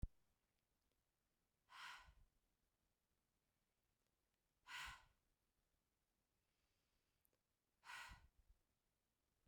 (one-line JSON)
{"exhalation_length": "9.5 s", "exhalation_amplitude": 687, "exhalation_signal_mean_std_ratio": 0.27, "survey_phase": "beta (2021-08-13 to 2022-03-07)", "age": "18-44", "gender": "Female", "wearing_mask": "No", "symptom_none": true, "smoker_status": "Never smoked", "respiratory_condition_asthma": false, "respiratory_condition_other": false, "recruitment_source": "REACT", "submission_delay": "1 day", "covid_test_result": "Negative", "covid_test_method": "RT-qPCR", "influenza_a_test_result": "Negative", "influenza_b_test_result": "Negative"}